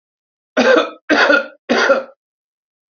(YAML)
three_cough_length: 2.9 s
three_cough_amplitude: 30362
three_cough_signal_mean_std_ratio: 0.5
survey_phase: alpha (2021-03-01 to 2021-08-12)
age: 45-64
gender: Male
wearing_mask: 'No'
symptom_abdominal_pain: true
symptom_onset: 5 days
smoker_status: Current smoker (1 to 10 cigarettes per day)
respiratory_condition_asthma: false
respiratory_condition_other: false
recruitment_source: REACT
submission_delay: 1 day
covid_test_result: Negative
covid_test_method: RT-qPCR